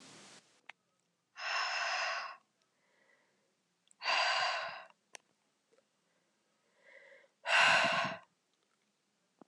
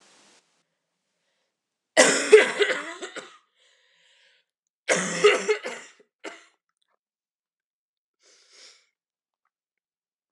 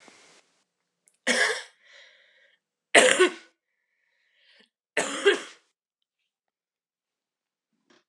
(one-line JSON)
{"exhalation_length": "9.5 s", "exhalation_amplitude": 7546, "exhalation_signal_mean_std_ratio": 0.39, "cough_length": "10.3 s", "cough_amplitude": 27945, "cough_signal_mean_std_ratio": 0.26, "three_cough_length": "8.1 s", "three_cough_amplitude": 28277, "three_cough_signal_mean_std_ratio": 0.26, "survey_phase": "alpha (2021-03-01 to 2021-08-12)", "age": "18-44", "gender": "Female", "wearing_mask": "No", "symptom_cough_any": true, "symptom_new_continuous_cough": true, "symptom_shortness_of_breath": true, "symptom_fatigue": true, "symptom_headache": true, "symptom_change_to_sense_of_smell_or_taste": true, "symptom_loss_of_taste": true, "smoker_status": "Never smoked", "respiratory_condition_asthma": false, "respiratory_condition_other": false, "recruitment_source": "Test and Trace", "submission_delay": "2 days", "covid_test_result": "Positive", "covid_test_method": "RT-qPCR"}